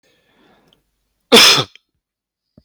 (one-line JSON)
{"cough_length": "2.6 s", "cough_amplitude": 32768, "cough_signal_mean_std_ratio": 0.28, "survey_phase": "beta (2021-08-13 to 2022-03-07)", "age": "45-64", "gender": "Male", "wearing_mask": "No", "symptom_none": true, "smoker_status": "Never smoked", "respiratory_condition_asthma": false, "respiratory_condition_other": false, "recruitment_source": "REACT", "submission_delay": "1 day", "covid_test_result": "Negative", "covid_test_method": "RT-qPCR", "influenza_a_test_result": "Negative", "influenza_b_test_result": "Negative"}